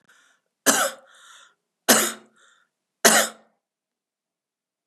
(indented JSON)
{
  "three_cough_length": "4.9 s",
  "three_cough_amplitude": 32767,
  "three_cough_signal_mean_std_ratio": 0.29,
  "survey_phase": "beta (2021-08-13 to 2022-03-07)",
  "age": "65+",
  "gender": "Female",
  "wearing_mask": "No",
  "symptom_none": true,
  "smoker_status": "Never smoked",
  "respiratory_condition_asthma": false,
  "respiratory_condition_other": false,
  "recruitment_source": "REACT",
  "submission_delay": "1 day",
  "covid_test_result": "Negative",
  "covid_test_method": "RT-qPCR",
  "influenza_a_test_result": "Negative",
  "influenza_b_test_result": "Negative"
}